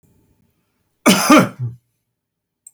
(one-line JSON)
{"cough_length": "2.7 s", "cough_amplitude": 32768, "cough_signal_mean_std_ratio": 0.33, "survey_phase": "beta (2021-08-13 to 2022-03-07)", "age": "65+", "gender": "Male", "wearing_mask": "No", "symptom_none": true, "smoker_status": "Never smoked", "respiratory_condition_asthma": false, "respiratory_condition_other": false, "recruitment_source": "REACT", "submission_delay": "3 days", "covid_test_result": "Negative", "covid_test_method": "RT-qPCR"}